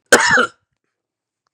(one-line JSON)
{"cough_length": "1.5 s", "cough_amplitude": 32768, "cough_signal_mean_std_ratio": 0.37, "survey_phase": "beta (2021-08-13 to 2022-03-07)", "age": "45-64", "gender": "Male", "wearing_mask": "No", "symptom_none": true, "smoker_status": "Never smoked", "respiratory_condition_asthma": false, "respiratory_condition_other": false, "recruitment_source": "REACT", "submission_delay": "1 day", "covid_test_result": "Negative", "covid_test_method": "RT-qPCR", "influenza_a_test_result": "Negative", "influenza_b_test_result": "Negative"}